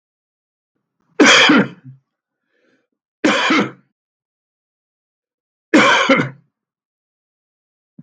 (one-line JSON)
{"three_cough_length": "8.0 s", "three_cough_amplitude": 32768, "three_cough_signal_mean_std_ratio": 0.34, "survey_phase": "beta (2021-08-13 to 2022-03-07)", "age": "65+", "gender": "Male", "wearing_mask": "No", "symptom_none": true, "symptom_onset": "10 days", "smoker_status": "Never smoked", "respiratory_condition_asthma": false, "respiratory_condition_other": false, "recruitment_source": "REACT", "submission_delay": "2 days", "covid_test_result": "Negative", "covid_test_method": "RT-qPCR", "influenza_a_test_result": "Negative", "influenza_b_test_result": "Negative"}